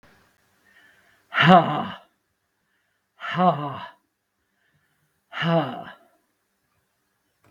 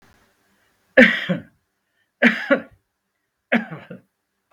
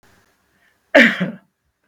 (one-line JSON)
{"exhalation_length": "7.5 s", "exhalation_amplitude": 32768, "exhalation_signal_mean_std_ratio": 0.29, "three_cough_length": "4.5 s", "three_cough_amplitude": 32768, "three_cough_signal_mean_std_ratio": 0.29, "cough_length": "1.9 s", "cough_amplitude": 32768, "cough_signal_mean_std_ratio": 0.3, "survey_phase": "beta (2021-08-13 to 2022-03-07)", "age": "65+", "gender": "Male", "wearing_mask": "No", "symptom_runny_or_blocked_nose": true, "symptom_headache": true, "smoker_status": "Never smoked", "respiratory_condition_asthma": false, "respiratory_condition_other": false, "recruitment_source": "REACT", "submission_delay": "2 days", "covid_test_result": "Negative", "covid_test_method": "RT-qPCR", "influenza_a_test_result": "Negative", "influenza_b_test_result": "Negative"}